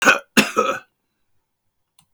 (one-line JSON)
{"cough_length": "2.1 s", "cough_amplitude": 26513, "cough_signal_mean_std_ratio": 0.35, "survey_phase": "beta (2021-08-13 to 2022-03-07)", "age": "65+", "gender": "Male", "wearing_mask": "No", "symptom_none": true, "smoker_status": "Ex-smoker", "respiratory_condition_asthma": false, "respiratory_condition_other": false, "recruitment_source": "REACT", "submission_delay": "2 days", "covid_test_result": "Negative", "covid_test_method": "RT-qPCR", "influenza_a_test_result": "Negative", "influenza_b_test_result": "Negative"}